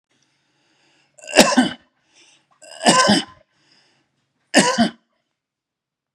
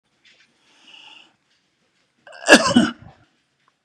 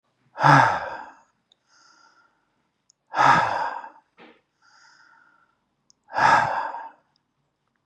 {"three_cough_length": "6.1 s", "three_cough_amplitude": 32768, "three_cough_signal_mean_std_ratio": 0.32, "cough_length": "3.8 s", "cough_amplitude": 32768, "cough_signal_mean_std_ratio": 0.24, "exhalation_length": "7.9 s", "exhalation_amplitude": 26089, "exhalation_signal_mean_std_ratio": 0.35, "survey_phase": "beta (2021-08-13 to 2022-03-07)", "age": "65+", "gender": "Male", "wearing_mask": "No", "symptom_none": true, "smoker_status": "Never smoked", "respiratory_condition_asthma": false, "respiratory_condition_other": false, "recruitment_source": "REACT", "submission_delay": "3 days", "covid_test_result": "Negative", "covid_test_method": "RT-qPCR", "influenza_a_test_result": "Negative", "influenza_b_test_result": "Negative"}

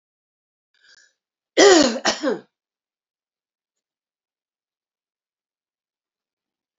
{"cough_length": "6.8 s", "cough_amplitude": 29453, "cough_signal_mean_std_ratio": 0.22, "survey_phase": "beta (2021-08-13 to 2022-03-07)", "age": "65+", "gender": "Female", "wearing_mask": "No", "symptom_cough_any": true, "symptom_onset": "12 days", "smoker_status": "Never smoked", "respiratory_condition_asthma": true, "respiratory_condition_other": false, "recruitment_source": "REACT", "submission_delay": "5 days", "covid_test_result": "Negative", "covid_test_method": "RT-qPCR"}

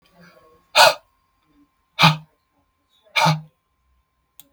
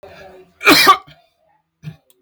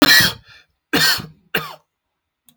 {"exhalation_length": "4.5 s", "exhalation_amplitude": 32768, "exhalation_signal_mean_std_ratio": 0.28, "cough_length": "2.2 s", "cough_amplitude": 32768, "cough_signal_mean_std_ratio": 0.34, "three_cough_length": "2.6 s", "three_cough_amplitude": 32768, "three_cough_signal_mean_std_ratio": 0.4, "survey_phase": "beta (2021-08-13 to 2022-03-07)", "age": "45-64", "gender": "Male", "wearing_mask": "No", "symptom_none": true, "smoker_status": "Never smoked", "respiratory_condition_asthma": false, "respiratory_condition_other": false, "recruitment_source": "REACT", "submission_delay": "-13 days", "covid_test_result": "Negative", "covid_test_method": "RT-qPCR", "influenza_a_test_result": "Unknown/Void", "influenza_b_test_result": "Unknown/Void"}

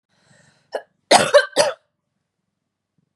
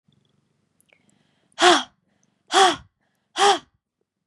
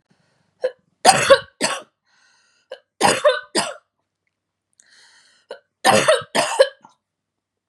{"cough_length": "3.2 s", "cough_amplitude": 32464, "cough_signal_mean_std_ratio": 0.28, "exhalation_length": "4.3 s", "exhalation_amplitude": 28829, "exhalation_signal_mean_std_ratio": 0.3, "three_cough_length": "7.7 s", "three_cough_amplitude": 32768, "three_cough_signal_mean_std_ratio": 0.35, "survey_phase": "beta (2021-08-13 to 2022-03-07)", "age": "18-44", "gender": "Female", "wearing_mask": "No", "symptom_none": true, "smoker_status": "Never smoked", "respiratory_condition_asthma": false, "respiratory_condition_other": false, "recruitment_source": "REACT", "submission_delay": "4 days", "covid_test_result": "Negative", "covid_test_method": "RT-qPCR", "influenza_a_test_result": "Negative", "influenza_b_test_result": "Negative"}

